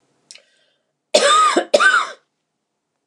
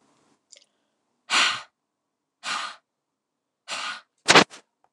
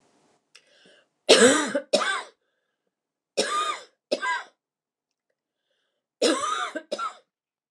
{"cough_length": "3.1 s", "cough_amplitude": 29204, "cough_signal_mean_std_ratio": 0.44, "exhalation_length": "4.9 s", "exhalation_amplitude": 29204, "exhalation_signal_mean_std_ratio": 0.26, "three_cough_length": "7.7 s", "three_cough_amplitude": 27995, "three_cough_signal_mean_std_ratio": 0.36, "survey_phase": "beta (2021-08-13 to 2022-03-07)", "age": "65+", "gender": "Female", "wearing_mask": "No", "symptom_none": true, "smoker_status": "Ex-smoker", "respiratory_condition_asthma": true, "respiratory_condition_other": false, "recruitment_source": "REACT", "submission_delay": "1 day", "covid_test_result": "Negative", "covid_test_method": "RT-qPCR"}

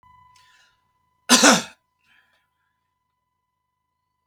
{"cough_length": "4.3 s", "cough_amplitude": 32768, "cough_signal_mean_std_ratio": 0.21, "survey_phase": "beta (2021-08-13 to 2022-03-07)", "age": "45-64", "gender": "Male", "wearing_mask": "No", "symptom_fatigue": true, "smoker_status": "Never smoked", "respiratory_condition_asthma": false, "respiratory_condition_other": false, "recruitment_source": "REACT", "submission_delay": "1 day", "covid_test_result": "Negative", "covid_test_method": "RT-qPCR", "influenza_a_test_result": "Negative", "influenza_b_test_result": "Negative"}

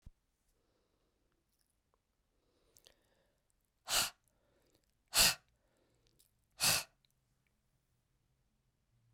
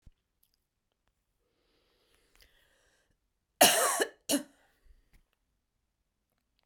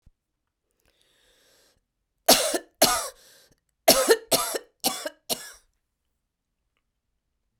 {"exhalation_length": "9.1 s", "exhalation_amplitude": 7019, "exhalation_signal_mean_std_ratio": 0.2, "cough_length": "6.7 s", "cough_amplitude": 14763, "cough_signal_mean_std_ratio": 0.21, "three_cough_length": "7.6 s", "three_cough_amplitude": 28101, "three_cough_signal_mean_std_ratio": 0.29, "survey_phase": "beta (2021-08-13 to 2022-03-07)", "age": "65+", "gender": "Female", "wearing_mask": "No", "symptom_cough_any": true, "symptom_runny_or_blocked_nose": true, "symptom_change_to_sense_of_smell_or_taste": true, "symptom_loss_of_taste": true, "symptom_onset": "6 days", "smoker_status": "Ex-smoker", "respiratory_condition_asthma": false, "respiratory_condition_other": false, "recruitment_source": "Test and Trace", "submission_delay": "1 day", "covid_test_result": "Positive", "covid_test_method": "RT-qPCR", "covid_ct_value": 13.4, "covid_ct_gene": "ORF1ab gene", "covid_ct_mean": 13.8, "covid_viral_load": "29000000 copies/ml", "covid_viral_load_category": "High viral load (>1M copies/ml)"}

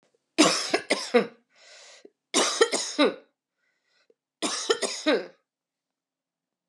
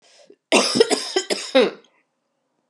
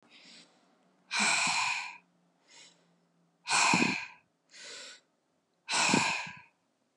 {"three_cough_length": "6.7 s", "three_cough_amplitude": 19863, "three_cough_signal_mean_std_ratio": 0.4, "cough_length": "2.7 s", "cough_amplitude": 29841, "cough_signal_mean_std_ratio": 0.43, "exhalation_length": "7.0 s", "exhalation_amplitude": 8429, "exhalation_signal_mean_std_ratio": 0.45, "survey_phase": "alpha (2021-03-01 to 2021-08-12)", "age": "45-64", "gender": "Female", "wearing_mask": "No", "symptom_cough_any": true, "symptom_shortness_of_breath": true, "symptom_fatigue": true, "symptom_change_to_sense_of_smell_or_taste": true, "symptom_loss_of_taste": true, "symptom_onset": "3 days", "smoker_status": "Current smoker (1 to 10 cigarettes per day)", "respiratory_condition_asthma": false, "respiratory_condition_other": false, "recruitment_source": "Test and Trace", "submission_delay": "2 days", "covid_test_result": "Positive", "covid_test_method": "RT-qPCR", "covid_ct_value": 15.4, "covid_ct_gene": "ORF1ab gene", "covid_ct_mean": 15.7, "covid_viral_load": "7200000 copies/ml", "covid_viral_load_category": "High viral load (>1M copies/ml)"}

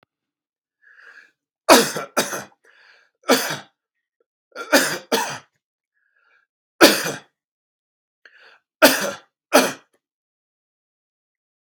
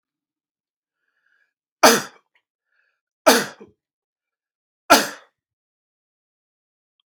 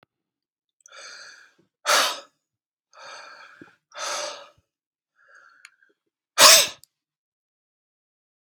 {"cough_length": "11.6 s", "cough_amplitude": 32768, "cough_signal_mean_std_ratio": 0.28, "three_cough_length": "7.1 s", "three_cough_amplitude": 32768, "three_cough_signal_mean_std_ratio": 0.2, "exhalation_length": "8.5 s", "exhalation_amplitude": 32768, "exhalation_signal_mean_std_ratio": 0.22, "survey_phase": "beta (2021-08-13 to 2022-03-07)", "age": "65+", "gender": "Male", "wearing_mask": "No", "symptom_none": true, "smoker_status": "Never smoked", "respiratory_condition_asthma": false, "respiratory_condition_other": false, "recruitment_source": "REACT", "submission_delay": "1 day", "covid_test_result": "Negative", "covid_test_method": "RT-qPCR", "influenza_a_test_result": "Negative", "influenza_b_test_result": "Negative"}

